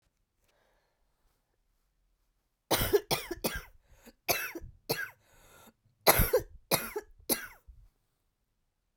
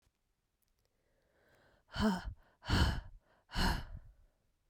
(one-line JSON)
{"three_cough_length": "9.0 s", "three_cough_amplitude": 18046, "three_cough_signal_mean_std_ratio": 0.31, "exhalation_length": "4.7 s", "exhalation_amplitude": 4107, "exhalation_signal_mean_std_ratio": 0.39, "survey_phase": "beta (2021-08-13 to 2022-03-07)", "age": "18-44", "gender": "Female", "wearing_mask": "No", "symptom_cough_any": true, "symptom_runny_or_blocked_nose": true, "symptom_diarrhoea": true, "symptom_fatigue": true, "symptom_fever_high_temperature": true, "symptom_change_to_sense_of_smell_or_taste": true, "symptom_loss_of_taste": true, "symptom_onset": "3 days", "smoker_status": "Never smoked", "respiratory_condition_asthma": false, "respiratory_condition_other": false, "recruitment_source": "Test and Trace", "submission_delay": "2 days", "covid_test_result": "Positive", "covid_test_method": "RT-qPCR", "covid_ct_value": 29.5, "covid_ct_gene": "ORF1ab gene", "covid_ct_mean": 29.8, "covid_viral_load": "170 copies/ml", "covid_viral_load_category": "Minimal viral load (< 10K copies/ml)"}